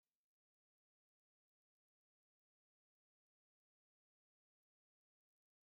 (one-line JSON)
{"exhalation_length": "5.6 s", "exhalation_amplitude": 2, "exhalation_signal_mean_std_ratio": 0.06, "survey_phase": "beta (2021-08-13 to 2022-03-07)", "age": "65+", "gender": "Male", "wearing_mask": "No", "symptom_none": true, "smoker_status": "Never smoked", "respiratory_condition_asthma": false, "respiratory_condition_other": false, "recruitment_source": "REACT", "submission_delay": "1 day", "covid_test_result": "Negative", "covid_test_method": "RT-qPCR", "influenza_a_test_result": "Negative", "influenza_b_test_result": "Negative"}